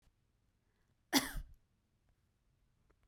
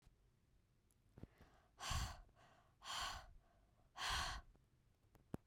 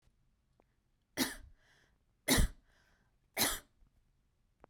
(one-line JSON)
{"cough_length": "3.1 s", "cough_amplitude": 6393, "cough_signal_mean_std_ratio": 0.21, "exhalation_length": "5.5 s", "exhalation_amplitude": 996, "exhalation_signal_mean_std_ratio": 0.44, "three_cough_length": "4.7 s", "three_cough_amplitude": 5771, "three_cough_signal_mean_std_ratio": 0.28, "survey_phase": "beta (2021-08-13 to 2022-03-07)", "age": "18-44", "gender": "Female", "wearing_mask": "No", "symptom_none": true, "smoker_status": "Never smoked", "respiratory_condition_asthma": false, "respiratory_condition_other": false, "recruitment_source": "REACT", "submission_delay": "1 day", "covid_test_result": "Negative", "covid_test_method": "RT-qPCR"}